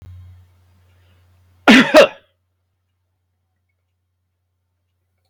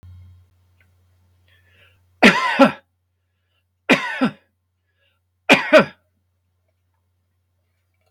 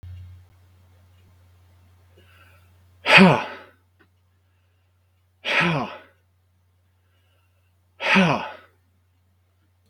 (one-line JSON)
{"cough_length": "5.3 s", "cough_amplitude": 32768, "cough_signal_mean_std_ratio": 0.22, "three_cough_length": "8.1 s", "three_cough_amplitude": 32768, "three_cough_signal_mean_std_ratio": 0.26, "exhalation_length": "9.9 s", "exhalation_amplitude": 32768, "exhalation_signal_mean_std_ratio": 0.27, "survey_phase": "beta (2021-08-13 to 2022-03-07)", "age": "45-64", "gender": "Male", "wearing_mask": "No", "symptom_abdominal_pain": true, "symptom_diarrhoea": true, "symptom_fatigue": true, "symptom_headache": true, "symptom_onset": "12 days", "smoker_status": "Never smoked", "respiratory_condition_asthma": false, "respiratory_condition_other": false, "recruitment_source": "REACT", "submission_delay": "1 day", "covid_test_result": "Negative", "covid_test_method": "RT-qPCR"}